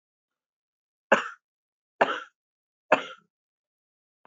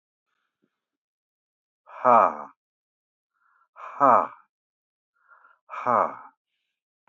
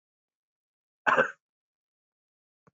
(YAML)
three_cough_length: 4.3 s
three_cough_amplitude: 21587
three_cough_signal_mean_std_ratio: 0.2
exhalation_length: 7.1 s
exhalation_amplitude: 21828
exhalation_signal_mean_std_ratio: 0.25
cough_length: 2.7 s
cough_amplitude: 13770
cough_signal_mean_std_ratio: 0.21
survey_phase: beta (2021-08-13 to 2022-03-07)
age: 65+
gender: Male
wearing_mask: 'No'
symptom_change_to_sense_of_smell_or_taste: true
smoker_status: Ex-smoker
respiratory_condition_asthma: false
respiratory_condition_other: false
recruitment_source: REACT
submission_delay: 3 days
covid_test_result: Negative
covid_test_method: RT-qPCR
influenza_a_test_result: Negative
influenza_b_test_result: Negative